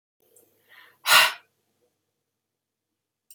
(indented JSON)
{
  "exhalation_length": "3.3 s",
  "exhalation_amplitude": 24446,
  "exhalation_signal_mean_std_ratio": 0.21,
  "survey_phase": "beta (2021-08-13 to 2022-03-07)",
  "age": "45-64",
  "gender": "Female",
  "wearing_mask": "No",
  "symptom_none": true,
  "smoker_status": "Ex-smoker",
  "respiratory_condition_asthma": false,
  "respiratory_condition_other": false,
  "recruitment_source": "REACT",
  "submission_delay": "1 day",
  "covid_test_result": "Negative",
  "covid_test_method": "RT-qPCR",
  "influenza_a_test_result": "Unknown/Void",
  "influenza_b_test_result": "Unknown/Void"
}